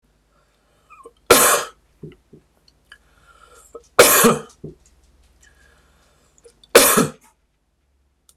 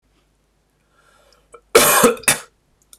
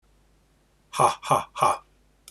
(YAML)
three_cough_length: 8.4 s
three_cough_amplitude: 26028
three_cough_signal_mean_std_ratio: 0.29
cough_length: 3.0 s
cough_amplitude: 26028
cough_signal_mean_std_ratio: 0.34
exhalation_length: 2.3 s
exhalation_amplitude: 17798
exhalation_signal_mean_std_ratio: 0.37
survey_phase: beta (2021-08-13 to 2022-03-07)
age: 45-64
gender: Male
wearing_mask: 'No'
symptom_runny_or_blocked_nose: true
smoker_status: Never smoked
respiratory_condition_asthma: true
respiratory_condition_other: false
recruitment_source: REACT
submission_delay: 2 days
covid_test_result: Negative
covid_test_method: RT-qPCR
influenza_a_test_result: Negative
influenza_b_test_result: Negative